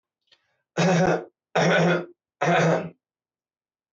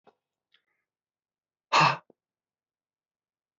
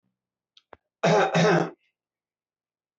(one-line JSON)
{"three_cough_length": "3.9 s", "three_cough_amplitude": 15376, "three_cough_signal_mean_std_ratio": 0.52, "exhalation_length": "3.6 s", "exhalation_amplitude": 12719, "exhalation_signal_mean_std_ratio": 0.2, "cough_length": "3.0 s", "cough_amplitude": 11977, "cough_signal_mean_std_ratio": 0.38, "survey_phase": "beta (2021-08-13 to 2022-03-07)", "age": "45-64", "gender": "Male", "wearing_mask": "No", "symptom_none": true, "smoker_status": "Ex-smoker", "respiratory_condition_asthma": false, "respiratory_condition_other": false, "recruitment_source": "REACT", "submission_delay": "5 days", "covid_test_result": "Negative", "covid_test_method": "RT-qPCR"}